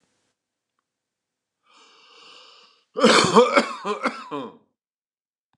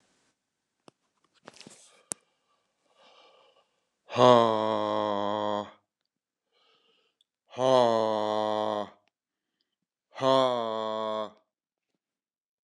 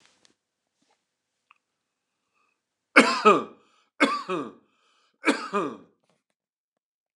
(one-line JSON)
{"cough_length": "5.6 s", "cough_amplitude": 28481, "cough_signal_mean_std_ratio": 0.31, "exhalation_length": "12.6 s", "exhalation_amplitude": 16654, "exhalation_signal_mean_std_ratio": 0.34, "three_cough_length": "7.2 s", "three_cough_amplitude": 28491, "three_cough_signal_mean_std_ratio": 0.26, "survey_phase": "beta (2021-08-13 to 2022-03-07)", "age": "45-64", "gender": "Male", "wearing_mask": "No", "symptom_sore_throat": true, "smoker_status": "Ex-smoker", "respiratory_condition_asthma": false, "respiratory_condition_other": false, "recruitment_source": "REACT", "submission_delay": "1 day", "covid_test_result": "Negative", "covid_test_method": "RT-qPCR", "influenza_a_test_result": "Negative", "influenza_b_test_result": "Negative"}